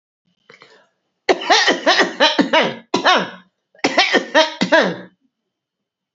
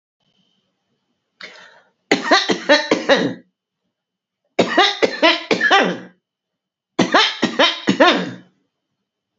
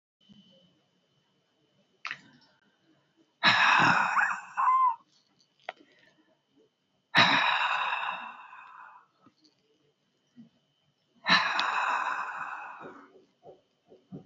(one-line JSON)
{"cough_length": "6.1 s", "cough_amplitude": 32767, "cough_signal_mean_std_ratio": 0.49, "three_cough_length": "9.4 s", "three_cough_amplitude": 32767, "three_cough_signal_mean_std_ratio": 0.44, "exhalation_length": "14.3 s", "exhalation_amplitude": 14841, "exhalation_signal_mean_std_ratio": 0.42, "survey_phase": "alpha (2021-03-01 to 2021-08-12)", "age": "65+", "gender": "Female", "wearing_mask": "No", "symptom_none": true, "smoker_status": "Ex-smoker", "respiratory_condition_asthma": false, "respiratory_condition_other": true, "recruitment_source": "REACT", "submission_delay": "2 days", "covid_test_result": "Negative", "covid_test_method": "RT-qPCR"}